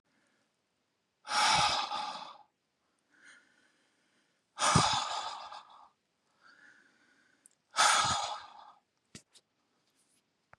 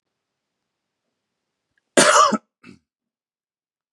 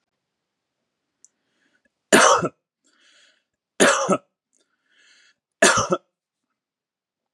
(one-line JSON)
{"exhalation_length": "10.6 s", "exhalation_amplitude": 8771, "exhalation_signal_mean_std_ratio": 0.37, "cough_length": "3.9 s", "cough_amplitude": 31639, "cough_signal_mean_std_ratio": 0.25, "three_cough_length": "7.3 s", "three_cough_amplitude": 29817, "three_cough_signal_mean_std_ratio": 0.28, "survey_phase": "beta (2021-08-13 to 2022-03-07)", "age": "18-44", "gender": "Male", "wearing_mask": "No", "symptom_none": true, "smoker_status": "Ex-smoker", "respiratory_condition_asthma": false, "respiratory_condition_other": false, "recruitment_source": "REACT", "submission_delay": "1 day", "covid_test_result": "Negative", "covid_test_method": "RT-qPCR", "influenza_a_test_result": "Negative", "influenza_b_test_result": "Negative"}